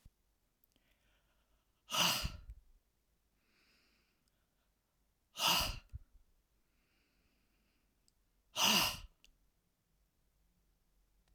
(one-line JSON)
{"exhalation_length": "11.3 s", "exhalation_amplitude": 4531, "exhalation_signal_mean_std_ratio": 0.27, "survey_phase": "alpha (2021-03-01 to 2021-08-12)", "age": "65+", "gender": "Male", "wearing_mask": "No", "symptom_none": true, "smoker_status": "Never smoked", "respiratory_condition_asthma": false, "respiratory_condition_other": false, "recruitment_source": "REACT", "submission_delay": "1 day", "covid_test_result": "Negative", "covid_test_method": "RT-qPCR"}